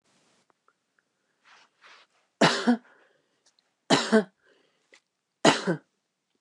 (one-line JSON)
{"three_cough_length": "6.4 s", "three_cough_amplitude": 22226, "three_cough_signal_mean_std_ratio": 0.27, "survey_phase": "beta (2021-08-13 to 2022-03-07)", "age": "65+", "gender": "Female", "wearing_mask": "No", "symptom_none": true, "smoker_status": "Never smoked", "respiratory_condition_asthma": false, "respiratory_condition_other": false, "recruitment_source": "REACT", "submission_delay": "1 day", "covid_test_result": "Negative", "covid_test_method": "RT-qPCR", "influenza_a_test_result": "Negative", "influenza_b_test_result": "Negative"}